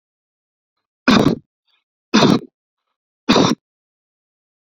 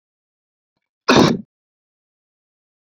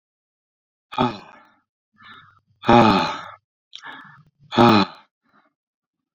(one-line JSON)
{"three_cough_length": "4.7 s", "three_cough_amplitude": 32347, "three_cough_signal_mean_std_ratio": 0.32, "cough_length": "3.0 s", "cough_amplitude": 31491, "cough_signal_mean_std_ratio": 0.24, "exhalation_length": "6.1 s", "exhalation_amplitude": 26956, "exhalation_signal_mean_std_ratio": 0.31, "survey_phase": "beta (2021-08-13 to 2022-03-07)", "age": "45-64", "gender": "Male", "wearing_mask": "No", "symptom_cough_any": true, "symptom_new_continuous_cough": true, "symptom_shortness_of_breath": true, "symptom_fatigue": true, "symptom_fever_high_temperature": true, "symptom_onset": "3 days", "smoker_status": "Never smoked", "respiratory_condition_asthma": false, "respiratory_condition_other": false, "recruitment_source": "Test and Trace", "submission_delay": "2 days", "covid_test_result": "Positive", "covid_test_method": "RT-qPCR", "covid_ct_value": 22.5, "covid_ct_gene": "ORF1ab gene", "covid_ct_mean": 23.1, "covid_viral_load": "27000 copies/ml", "covid_viral_load_category": "Low viral load (10K-1M copies/ml)"}